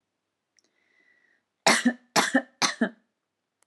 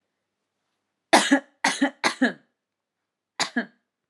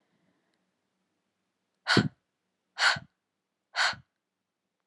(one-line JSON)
{"three_cough_length": "3.7 s", "three_cough_amplitude": 15873, "three_cough_signal_mean_std_ratio": 0.32, "cough_length": "4.1 s", "cough_amplitude": 30623, "cough_signal_mean_std_ratio": 0.32, "exhalation_length": "4.9 s", "exhalation_amplitude": 15560, "exhalation_signal_mean_std_ratio": 0.26, "survey_phase": "alpha (2021-03-01 to 2021-08-12)", "age": "18-44", "gender": "Female", "wearing_mask": "No", "symptom_fatigue": true, "smoker_status": "Never smoked", "respiratory_condition_asthma": false, "respiratory_condition_other": false, "recruitment_source": "REACT", "submission_delay": "1 day", "covid_test_result": "Negative", "covid_test_method": "RT-qPCR"}